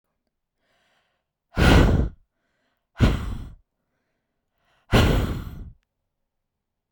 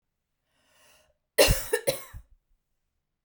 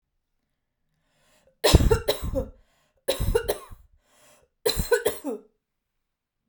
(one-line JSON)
{"exhalation_length": "6.9 s", "exhalation_amplitude": 25557, "exhalation_signal_mean_std_ratio": 0.35, "cough_length": "3.2 s", "cough_amplitude": 17825, "cough_signal_mean_std_ratio": 0.27, "three_cough_length": "6.5 s", "three_cough_amplitude": 32767, "three_cough_signal_mean_std_ratio": 0.35, "survey_phase": "beta (2021-08-13 to 2022-03-07)", "age": "18-44", "gender": "Female", "wearing_mask": "No", "symptom_none": true, "symptom_onset": "8 days", "smoker_status": "Ex-smoker", "respiratory_condition_asthma": false, "respiratory_condition_other": false, "recruitment_source": "REACT", "submission_delay": "1 day", "covid_test_result": "Negative", "covid_test_method": "RT-qPCR"}